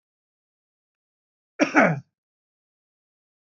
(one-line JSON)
{"cough_length": "3.4 s", "cough_amplitude": 20200, "cough_signal_mean_std_ratio": 0.22, "survey_phase": "beta (2021-08-13 to 2022-03-07)", "age": "45-64", "gender": "Male", "wearing_mask": "No", "symptom_none": true, "symptom_onset": "7 days", "smoker_status": "Current smoker (1 to 10 cigarettes per day)", "respiratory_condition_asthma": false, "respiratory_condition_other": false, "recruitment_source": "REACT", "submission_delay": "2 days", "covid_test_result": "Negative", "covid_test_method": "RT-qPCR"}